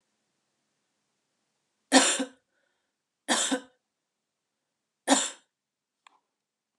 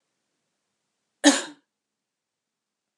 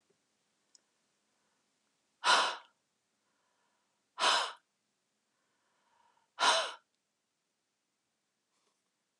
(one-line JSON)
{"three_cough_length": "6.8 s", "three_cough_amplitude": 20639, "three_cough_signal_mean_std_ratio": 0.25, "cough_length": "3.0 s", "cough_amplitude": 28639, "cough_signal_mean_std_ratio": 0.17, "exhalation_length": "9.2 s", "exhalation_amplitude": 7081, "exhalation_signal_mean_std_ratio": 0.25, "survey_phase": "beta (2021-08-13 to 2022-03-07)", "age": "18-44", "gender": "Female", "wearing_mask": "No", "symptom_none": true, "smoker_status": "Ex-smoker", "respiratory_condition_asthma": false, "respiratory_condition_other": false, "recruitment_source": "REACT", "submission_delay": "3 days", "covid_test_result": "Negative", "covid_test_method": "RT-qPCR"}